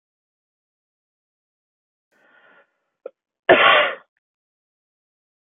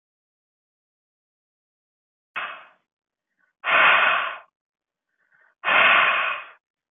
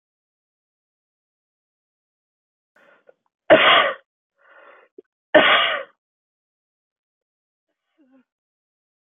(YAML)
cough_length: 5.5 s
cough_amplitude: 28162
cough_signal_mean_std_ratio: 0.22
exhalation_length: 6.9 s
exhalation_amplitude: 19682
exhalation_signal_mean_std_ratio: 0.38
three_cough_length: 9.1 s
three_cough_amplitude: 28045
three_cough_signal_mean_std_ratio: 0.24
survey_phase: beta (2021-08-13 to 2022-03-07)
age: 18-44
gender: Female
wearing_mask: 'No'
symptom_none: true
smoker_status: Never smoked
respiratory_condition_asthma: false
respiratory_condition_other: false
recruitment_source: REACT
submission_delay: 1 day
covid_test_result: Negative
covid_test_method: RT-qPCR